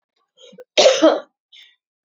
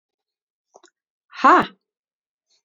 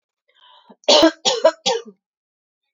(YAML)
cough_length: 2.0 s
cough_amplitude: 32069
cough_signal_mean_std_ratio: 0.35
exhalation_length: 2.6 s
exhalation_amplitude: 27403
exhalation_signal_mean_std_ratio: 0.23
three_cough_length: 2.7 s
three_cough_amplitude: 32767
three_cough_signal_mean_std_ratio: 0.36
survey_phase: beta (2021-08-13 to 2022-03-07)
age: 18-44
gender: Female
wearing_mask: 'No'
symptom_none: true
smoker_status: Never smoked
respiratory_condition_asthma: false
respiratory_condition_other: false
recruitment_source: REACT
submission_delay: 1 day
covid_test_result: Negative
covid_test_method: RT-qPCR
influenza_a_test_result: Negative
influenza_b_test_result: Negative